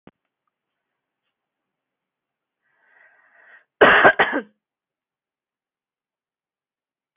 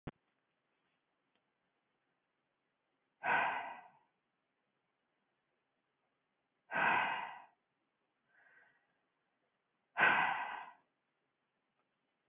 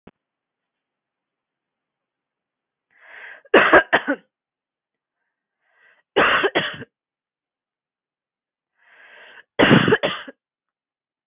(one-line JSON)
{"cough_length": "7.2 s", "cough_amplitude": 31810, "cough_signal_mean_std_ratio": 0.2, "exhalation_length": "12.3 s", "exhalation_amplitude": 4279, "exhalation_signal_mean_std_ratio": 0.29, "three_cough_length": "11.3 s", "three_cough_amplitude": 32476, "three_cough_signal_mean_std_ratio": 0.27, "survey_phase": "beta (2021-08-13 to 2022-03-07)", "age": "18-44", "gender": "Female", "wearing_mask": "No", "symptom_none": true, "smoker_status": "Ex-smoker", "respiratory_condition_asthma": false, "respiratory_condition_other": false, "recruitment_source": "REACT", "submission_delay": "2 days", "covid_test_result": "Negative", "covid_test_method": "RT-qPCR", "influenza_a_test_result": "Negative", "influenza_b_test_result": "Negative"}